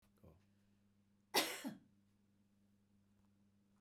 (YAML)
cough_length: 3.8 s
cough_amplitude: 2906
cough_signal_mean_std_ratio: 0.24
survey_phase: beta (2021-08-13 to 2022-03-07)
age: 65+
gender: Female
wearing_mask: 'No'
symptom_none: true
smoker_status: Never smoked
respiratory_condition_asthma: false
respiratory_condition_other: false
recruitment_source: REACT
submission_delay: 2 days
covid_test_result: Negative
covid_test_method: RT-qPCR
influenza_a_test_result: Negative
influenza_b_test_result: Negative